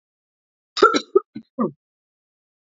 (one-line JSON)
{"cough_length": "2.6 s", "cough_amplitude": 27718, "cough_signal_mean_std_ratio": 0.26, "survey_phase": "beta (2021-08-13 to 2022-03-07)", "age": "45-64", "gender": "Female", "wearing_mask": "No", "symptom_cough_any": true, "symptom_runny_or_blocked_nose": true, "symptom_sore_throat": true, "smoker_status": "Never smoked", "recruitment_source": "Test and Trace", "submission_delay": "1 day", "covid_test_result": "Positive", "covid_test_method": "LFT"}